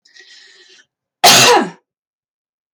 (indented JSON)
{
  "cough_length": "2.7 s",
  "cough_amplitude": 32768,
  "cough_signal_mean_std_ratio": 0.36,
  "survey_phase": "beta (2021-08-13 to 2022-03-07)",
  "age": "18-44",
  "gender": "Female",
  "wearing_mask": "No",
  "symptom_none": true,
  "smoker_status": "Never smoked",
  "respiratory_condition_asthma": false,
  "respiratory_condition_other": false,
  "recruitment_source": "REACT",
  "submission_delay": "2 days",
  "covid_test_result": "Negative",
  "covid_test_method": "RT-qPCR"
}